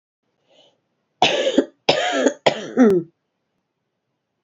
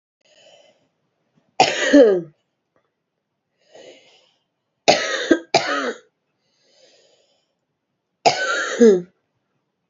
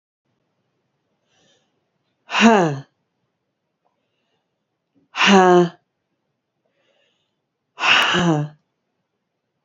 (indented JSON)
{
  "cough_length": "4.4 s",
  "cough_amplitude": 27448,
  "cough_signal_mean_std_ratio": 0.41,
  "three_cough_length": "9.9 s",
  "three_cough_amplitude": 32351,
  "three_cough_signal_mean_std_ratio": 0.32,
  "exhalation_length": "9.6 s",
  "exhalation_amplitude": 29455,
  "exhalation_signal_mean_std_ratio": 0.32,
  "survey_phase": "beta (2021-08-13 to 2022-03-07)",
  "age": "45-64",
  "gender": "Female",
  "wearing_mask": "No",
  "symptom_cough_any": true,
  "symptom_runny_or_blocked_nose": true,
  "symptom_sore_throat": true,
  "symptom_abdominal_pain": true,
  "symptom_fever_high_temperature": true,
  "symptom_headache": true,
  "symptom_other": true,
  "smoker_status": "Never smoked",
  "respiratory_condition_asthma": false,
  "respiratory_condition_other": false,
  "recruitment_source": "Test and Trace",
  "submission_delay": "0 days",
  "covid_test_result": "Positive",
  "covid_test_method": "LFT"
}